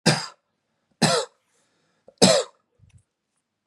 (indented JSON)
{
  "three_cough_length": "3.7 s",
  "three_cough_amplitude": 31718,
  "three_cough_signal_mean_std_ratio": 0.31,
  "survey_phase": "beta (2021-08-13 to 2022-03-07)",
  "age": "18-44",
  "gender": "Male",
  "wearing_mask": "No",
  "symptom_none": true,
  "smoker_status": "Ex-smoker",
  "respiratory_condition_asthma": false,
  "respiratory_condition_other": false,
  "recruitment_source": "REACT",
  "submission_delay": "1 day",
  "covid_test_result": "Negative",
  "covid_test_method": "RT-qPCR",
  "influenza_a_test_result": "Negative",
  "influenza_b_test_result": "Negative"
}